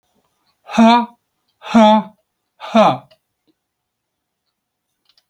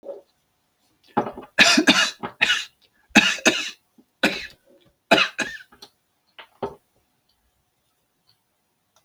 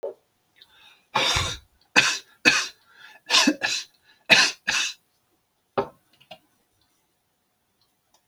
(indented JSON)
{
  "exhalation_length": "5.3 s",
  "exhalation_amplitude": 29135,
  "exhalation_signal_mean_std_ratio": 0.34,
  "three_cough_length": "9.0 s",
  "three_cough_amplitude": 31058,
  "three_cough_signal_mean_std_ratio": 0.32,
  "cough_length": "8.3 s",
  "cough_amplitude": 32767,
  "cough_signal_mean_std_ratio": 0.35,
  "survey_phase": "alpha (2021-03-01 to 2021-08-12)",
  "age": "65+",
  "gender": "Male",
  "wearing_mask": "No",
  "symptom_none": true,
  "smoker_status": "Never smoked",
  "respiratory_condition_asthma": true,
  "respiratory_condition_other": false,
  "recruitment_source": "REACT",
  "submission_delay": "1 day",
  "covid_test_result": "Negative",
  "covid_test_method": "RT-qPCR"
}